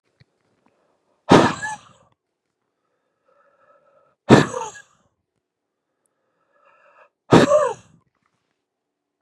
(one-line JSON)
{"exhalation_length": "9.2 s", "exhalation_amplitude": 32768, "exhalation_signal_mean_std_ratio": 0.24, "survey_phase": "beta (2021-08-13 to 2022-03-07)", "age": "45-64", "gender": "Male", "wearing_mask": "No", "symptom_cough_any": true, "symptom_fever_high_temperature": true, "smoker_status": "Ex-smoker", "respiratory_condition_asthma": false, "respiratory_condition_other": false, "recruitment_source": "Test and Trace", "submission_delay": "1 day", "covid_test_result": "Negative", "covid_test_method": "RT-qPCR"}